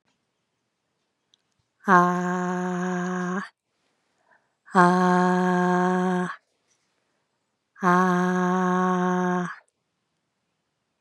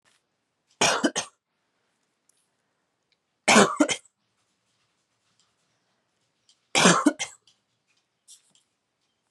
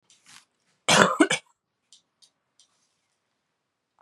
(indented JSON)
{
  "exhalation_length": "11.0 s",
  "exhalation_amplitude": 27382,
  "exhalation_signal_mean_std_ratio": 0.51,
  "three_cough_length": "9.3 s",
  "three_cough_amplitude": 25823,
  "three_cough_signal_mean_std_ratio": 0.25,
  "cough_length": "4.0 s",
  "cough_amplitude": 32767,
  "cough_signal_mean_std_ratio": 0.24,
  "survey_phase": "beta (2021-08-13 to 2022-03-07)",
  "age": "18-44",
  "gender": "Female",
  "wearing_mask": "No",
  "symptom_cough_any": true,
  "symptom_fatigue": true,
  "symptom_onset": "4 days",
  "smoker_status": "Never smoked",
  "respiratory_condition_asthma": false,
  "respiratory_condition_other": false,
  "recruitment_source": "Test and Trace",
  "submission_delay": "2 days",
  "covid_test_result": "Positive",
  "covid_test_method": "RT-qPCR"
}